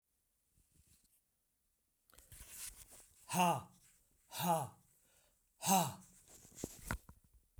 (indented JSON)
{
  "exhalation_length": "7.6 s",
  "exhalation_amplitude": 3802,
  "exhalation_signal_mean_std_ratio": 0.32,
  "survey_phase": "beta (2021-08-13 to 2022-03-07)",
  "age": "65+",
  "gender": "Male",
  "wearing_mask": "No",
  "symptom_none": true,
  "smoker_status": "Ex-smoker",
  "respiratory_condition_asthma": false,
  "respiratory_condition_other": false,
  "recruitment_source": "REACT",
  "submission_delay": "2 days",
  "covid_test_result": "Negative",
  "covid_test_method": "RT-qPCR",
  "influenza_a_test_result": "Negative",
  "influenza_b_test_result": "Negative"
}